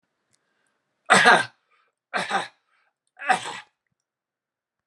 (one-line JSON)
{"three_cough_length": "4.9 s", "three_cough_amplitude": 30581, "three_cough_signal_mean_std_ratio": 0.28, "survey_phase": "alpha (2021-03-01 to 2021-08-12)", "age": "18-44", "gender": "Male", "wearing_mask": "No", "symptom_none": true, "symptom_onset": "12 days", "smoker_status": "Never smoked", "respiratory_condition_asthma": false, "respiratory_condition_other": false, "recruitment_source": "REACT", "submission_delay": "2 days", "covid_test_result": "Negative", "covid_test_method": "RT-qPCR"}